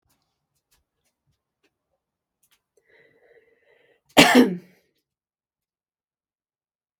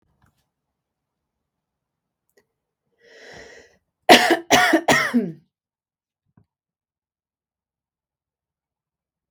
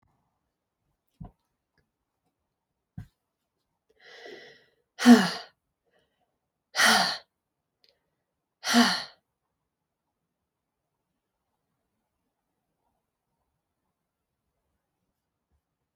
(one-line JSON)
{"cough_length": "7.0 s", "cough_amplitude": 32766, "cough_signal_mean_std_ratio": 0.17, "three_cough_length": "9.3 s", "three_cough_amplitude": 32768, "three_cough_signal_mean_std_ratio": 0.24, "exhalation_length": "16.0 s", "exhalation_amplitude": 23307, "exhalation_signal_mean_std_ratio": 0.18, "survey_phase": "beta (2021-08-13 to 2022-03-07)", "age": "18-44", "gender": "Female", "wearing_mask": "No", "symptom_none": true, "smoker_status": "Never smoked", "respiratory_condition_asthma": false, "respiratory_condition_other": false, "recruitment_source": "REACT", "submission_delay": "2 days", "covid_test_result": "Negative", "covid_test_method": "RT-qPCR", "influenza_a_test_result": "Negative", "influenza_b_test_result": "Negative"}